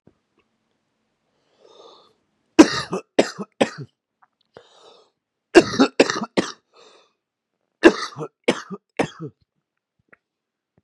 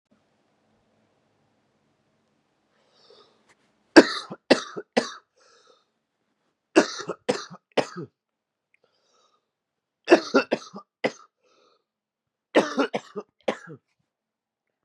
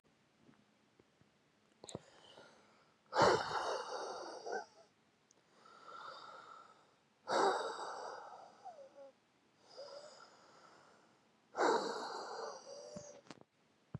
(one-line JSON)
{"cough_length": "10.8 s", "cough_amplitude": 32768, "cough_signal_mean_std_ratio": 0.22, "three_cough_length": "14.8 s", "three_cough_amplitude": 32768, "three_cough_signal_mean_std_ratio": 0.2, "exhalation_length": "14.0 s", "exhalation_amplitude": 4619, "exhalation_signal_mean_std_ratio": 0.39, "survey_phase": "beta (2021-08-13 to 2022-03-07)", "age": "18-44", "gender": "Male", "wearing_mask": "Yes", "symptom_cough_any": true, "symptom_runny_or_blocked_nose": true, "symptom_onset": "4 days", "smoker_status": "Current smoker (1 to 10 cigarettes per day)", "respiratory_condition_asthma": false, "respiratory_condition_other": false, "recruitment_source": "Test and Trace", "submission_delay": "2 days", "covid_test_result": "Positive", "covid_test_method": "RT-qPCR", "covid_ct_value": 29.0, "covid_ct_gene": "N gene"}